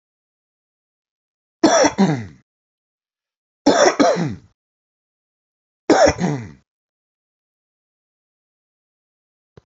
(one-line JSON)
{"three_cough_length": "9.7 s", "three_cough_amplitude": 32768, "three_cough_signal_mean_std_ratio": 0.31, "survey_phase": "beta (2021-08-13 to 2022-03-07)", "age": "45-64", "gender": "Male", "wearing_mask": "No", "symptom_none": true, "smoker_status": "Ex-smoker", "respiratory_condition_asthma": false, "respiratory_condition_other": false, "recruitment_source": "REACT", "submission_delay": "2 days", "covid_test_result": "Negative", "covid_test_method": "RT-qPCR"}